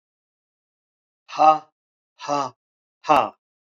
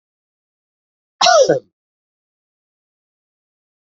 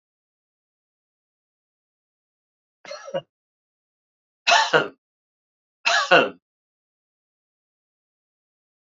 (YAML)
exhalation_length: 3.8 s
exhalation_amplitude: 26254
exhalation_signal_mean_std_ratio: 0.28
cough_length: 3.9 s
cough_amplitude: 30586
cough_signal_mean_std_ratio: 0.24
three_cough_length: 9.0 s
three_cough_amplitude: 26802
three_cough_signal_mean_std_ratio: 0.22
survey_phase: beta (2021-08-13 to 2022-03-07)
age: 45-64
gender: Male
wearing_mask: 'No'
symptom_runny_or_blocked_nose: true
symptom_fatigue: true
symptom_change_to_sense_of_smell_or_taste: true
symptom_onset: 63 days
smoker_status: Never smoked
respiratory_condition_asthma: false
respiratory_condition_other: false
recruitment_source: Test and Trace
submission_delay: 62 days
covid_test_result: Negative
covid_test_method: RT-qPCR